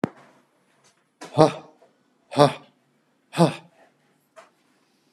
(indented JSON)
{
  "exhalation_length": "5.1 s",
  "exhalation_amplitude": 32657,
  "exhalation_signal_mean_std_ratio": 0.22,
  "survey_phase": "beta (2021-08-13 to 2022-03-07)",
  "age": "65+",
  "gender": "Male",
  "wearing_mask": "No",
  "symptom_none": true,
  "smoker_status": "Ex-smoker",
  "respiratory_condition_asthma": false,
  "respiratory_condition_other": false,
  "recruitment_source": "REACT",
  "submission_delay": "1 day",
  "covid_test_result": "Negative",
  "covid_test_method": "RT-qPCR"
}